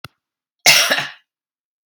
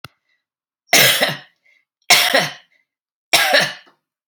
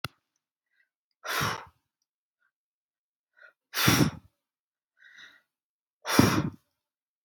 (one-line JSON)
{"cough_length": "1.9 s", "cough_amplitude": 32768, "cough_signal_mean_std_ratio": 0.35, "three_cough_length": "4.3 s", "three_cough_amplitude": 32768, "three_cough_signal_mean_std_ratio": 0.42, "exhalation_length": "7.2 s", "exhalation_amplitude": 18516, "exhalation_signal_mean_std_ratio": 0.28, "survey_phase": "alpha (2021-03-01 to 2021-08-12)", "age": "45-64", "gender": "Female", "wearing_mask": "No", "symptom_none": true, "smoker_status": "Never smoked", "respiratory_condition_asthma": false, "respiratory_condition_other": false, "recruitment_source": "REACT", "submission_delay": "13 days", "covid_test_result": "Negative", "covid_test_method": "RT-qPCR"}